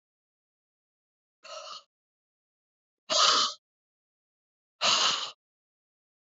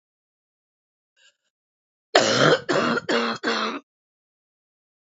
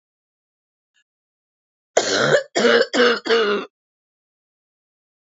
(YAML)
exhalation_length: 6.2 s
exhalation_amplitude: 11578
exhalation_signal_mean_std_ratio: 0.31
three_cough_length: 5.1 s
three_cough_amplitude: 32768
three_cough_signal_mean_std_ratio: 0.4
cough_length: 5.3 s
cough_amplitude: 26692
cough_signal_mean_std_ratio: 0.41
survey_phase: beta (2021-08-13 to 2022-03-07)
age: 18-44
gender: Female
wearing_mask: 'No'
symptom_fatigue: true
symptom_onset: 6 days
smoker_status: Never smoked
respiratory_condition_asthma: true
respiratory_condition_other: false
recruitment_source: REACT
submission_delay: 1 day
covid_test_result: Negative
covid_test_method: RT-qPCR
influenza_a_test_result: Negative
influenza_b_test_result: Negative